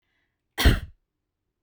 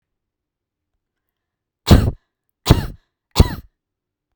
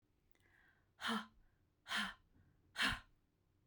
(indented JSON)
{
  "cough_length": "1.6 s",
  "cough_amplitude": 18473,
  "cough_signal_mean_std_ratio": 0.27,
  "three_cough_length": "4.4 s",
  "three_cough_amplitude": 32768,
  "three_cough_signal_mean_std_ratio": 0.24,
  "exhalation_length": "3.7 s",
  "exhalation_amplitude": 2031,
  "exhalation_signal_mean_std_ratio": 0.36,
  "survey_phase": "beta (2021-08-13 to 2022-03-07)",
  "age": "45-64",
  "gender": "Female",
  "wearing_mask": "No",
  "symptom_none": true,
  "smoker_status": "Never smoked",
  "respiratory_condition_asthma": false,
  "respiratory_condition_other": false,
  "recruitment_source": "REACT",
  "submission_delay": "0 days",
  "covid_test_result": "Negative",
  "covid_test_method": "RT-qPCR"
}